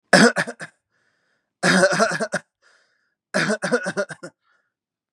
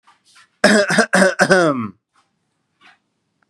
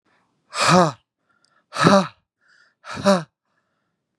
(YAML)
three_cough_length: 5.1 s
three_cough_amplitude: 32767
three_cough_signal_mean_std_ratio: 0.41
cough_length: 3.5 s
cough_amplitude: 32767
cough_signal_mean_std_ratio: 0.44
exhalation_length: 4.2 s
exhalation_amplitude: 30982
exhalation_signal_mean_std_ratio: 0.33
survey_phase: beta (2021-08-13 to 2022-03-07)
age: 18-44
gender: Male
wearing_mask: 'No'
symptom_none: true
symptom_onset: 12 days
smoker_status: Never smoked
respiratory_condition_asthma: false
respiratory_condition_other: false
recruitment_source: REACT
submission_delay: 1 day
covid_test_result: Negative
covid_test_method: RT-qPCR
influenza_a_test_result: Negative
influenza_b_test_result: Negative